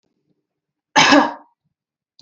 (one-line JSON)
{"cough_length": "2.2 s", "cough_amplitude": 31987, "cough_signal_mean_std_ratio": 0.32, "survey_phase": "beta (2021-08-13 to 2022-03-07)", "age": "18-44", "gender": "Female", "wearing_mask": "No", "symptom_none": true, "smoker_status": "Never smoked", "respiratory_condition_asthma": false, "respiratory_condition_other": false, "recruitment_source": "Test and Trace", "submission_delay": "1 day", "covid_test_result": "Positive", "covid_test_method": "RT-qPCR", "covid_ct_value": 28.2, "covid_ct_gene": "S gene", "covid_ct_mean": 28.4, "covid_viral_load": "480 copies/ml", "covid_viral_load_category": "Minimal viral load (< 10K copies/ml)"}